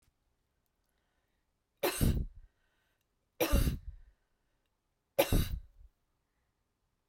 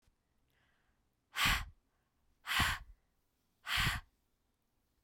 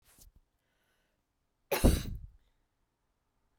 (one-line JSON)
{"three_cough_length": "7.1 s", "three_cough_amplitude": 7286, "three_cough_signal_mean_std_ratio": 0.32, "exhalation_length": "5.0 s", "exhalation_amplitude": 3927, "exhalation_signal_mean_std_ratio": 0.35, "cough_length": "3.6 s", "cough_amplitude": 8949, "cough_signal_mean_std_ratio": 0.23, "survey_phase": "beta (2021-08-13 to 2022-03-07)", "age": "18-44", "gender": "Female", "wearing_mask": "No", "symptom_none": true, "smoker_status": "Never smoked", "respiratory_condition_asthma": false, "respiratory_condition_other": false, "recruitment_source": "REACT", "submission_delay": "1 day", "covid_test_result": "Negative", "covid_test_method": "RT-qPCR"}